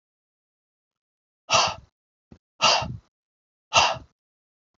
{"exhalation_length": "4.8 s", "exhalation_amplitude": 22015, "exhalation_signal_mean_std_ratio": 0.3, "survey_phase": "alpha (2021-03-01 to 2021-08-12)", "age": "45-64", "gender": "Male", "wearing_mask": "No", "symptom_none": true, "smoker_status": "Never smoked", "respiratory_condition_asthma": false, "respiratory_condition_other": false, "recruitment_source": "REACT", "submission_delay": "2 days", "covid_test_result": "Negative", "covid_test_method": "RT-qPCR"}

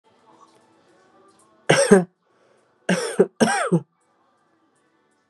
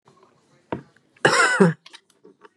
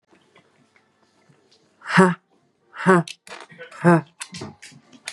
{"three_cough_length": "5.3 s", "three_cough_amplitude": 32767, "three_cough_signal_mean_std_ratio": 0.32, "cough_length": "2.6 s", "cough_amplitude": 26223, "cough_signal_mean_std_ratio": 0.36, "exhalation_length": "5.1 s", "exhalation_amplitude": 28286, "exhalation_signal_mean_std_ratio": 0.3, "survey_phase": "beta (2021-08-13 to 2022-03-07)", "age": "18-44", "gender": "Female", "wearing_mask": "Yes", "symptom_new_continuous_cough": true, "symptom_runny_or_blocked_nose": true, "symptom_shortness_of_breath": true, "symptom_diarrhoea": true, "symptom_fatigue": true, "symptom_headache": true, "symptom_change_to_sense_of_smell_or_taste": true, "symptom_loss_of_taste": true, "symptom_other": true, "symptom_onset": "2 days", "smoker_status": "Ex-smoker", "respiratory_condition_asthma": false, "respiratory_condition_other": false, "recruitment_source": "Test and Trace", "submission_delay": "2 days", "covid_test_result": "Positive", "covid_test_method": "RT-qPCR", "covid_ct_value": 20.6, "covid_ct_gene": "ORF1ab gene", "covid_ct_mean": 20.7, "covid_viral_load": "160000 copies/ml", "covid_viral_load_category": "Low viral load (10K-1M copies/ml)"}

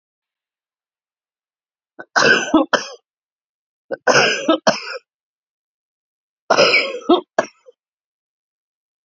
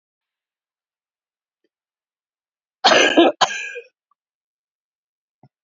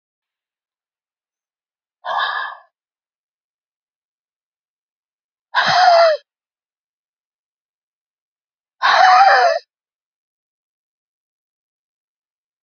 {"three_cough_length": "9.0 s", "three_cough_amplitude": 32768, "three_cough_signal_mean_std_ratio": 0.34, "cough_length": "5.6 s", "cough_amplitude": 29664, "cough_signal_mean_std_ratio": 0.25, "exhalation_length": "12.6 s", "exhalation_amplitude": 32767, "exhalation_signal_mean_std_ratio": 0.3, "survey_phase": "beta (2021-08-13 to 2022-03-07)", "age": "65+", "gender": "Female", "wearing_mask": "No", "symptom_cough_any": true, "symptom_runny_or_blocked_nose": true, "symptom_shortness_of_breath": true, "symptom_sore_throat": true, "symptom_abdominal_pain": true, "symptom_diarrhoea": true, "symptom_fatigue": true, "symptom_fever_high_temperature": true, "symptom_headache": true, "symptom_change_to_sense_of_smell_or_taste": true, "symptom_loss_of_taste": true, "smoker_status": "Ex-smoker", "respiratory_condition_asthma": false, "respiratory_condition_other": true, "recruitment_source": "Test and Trace", "submission_delay": "2 days", "covid_test_result": "Positive", "covid_test_method": "RT-qPCR", "covid_ct_value": 15.4, "covid_ct_gene": "ORF1ab gene", "covid_ct_mean": 15.8, "covid_viral_load": "6700000 copies/ml", "covid_viral_load_category": "High viral load (>1M copies/ml)"}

